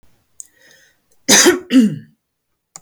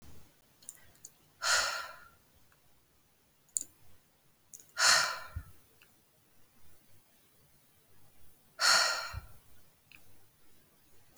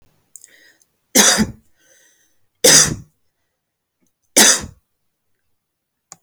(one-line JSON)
{"cough_length": "2.8 s", "cough_amplitude": 32768, "cough_signal_mean_std_ratio": 0.37, "exhalation_length": "11.2 s", "exhalation_amplitude": 15230, "exhalation_signal_mean_std_ratio": 0.32, "three_cough_length": "6.2 s", "three_cough_amplitude": 32768, "three_cough_signal_mean_std_ratio": 0.3, "survey_phase": "beta (2021-08-13 to 2022-03-07)", "age": "18-44", "gender": "Female", "wearing_mask": "No", "symptom_none": true, "symptom_onset": "13 days", "smoker_status": "Current smoker (1 to 10 cigarettes per day)", "respiratory_condition_asthma": false, "respiratory_condition_other": false, "recruitment_source": "REACT", "submission_delay": "1 day", "covid_test_result": "Negative", "covid_test_method": "RT-qPCR", "influenza_a_test_result": "Negative", "influenza_b_test_result": "Negative"}